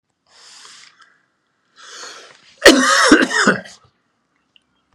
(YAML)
cough_length: 4.9 s
cough_amplitude: 32768
cough_signal_mean_std_ratio: 0.34
survey_phase: beta (2021-08-13 to 2022-03-07)
age: 65+
gender: Male
wearing_mask: 'No'
symptom_none: true
smoker_status: Never smoked
respiratory_condition_asthma: false
respiratory_condition_other: false
recruitment_source: REACT
submission_delay: 1 day
covid_test_result: Negative
covid_test_method: RT-qPCR